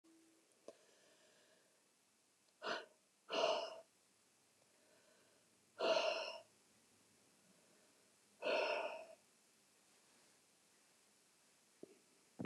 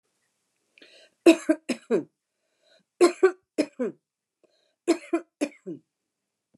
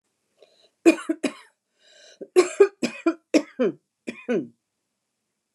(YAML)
exhalation_length: 12.5 s
exhalation_amplitude: 2763
exhalation_signal_mean_std_ratio: 0.33
three_cough_length: 6.6 s
three_cough_amplitude: 21894
three_cough_signal_mean_std_ratio: 0.27
cough_length: 5.5 s
cough_amplitude: 22920
cough_signal_mean_std_ratio: 0.3
survey_phase: alpha (2021-03-01 to 2021-08-12)
age: 65+
gender: Female
wearing_mask: 'No'
symptom_cough_any: true
symptom_headache: true
smoker_status: Never smoked
respiratory_condition_asthma: false
respiratory_condition_other: false
recruitment_source: REACT
submission_delay: 2 days
covid_test_result: Negative
covid_test_method: RT-qPCR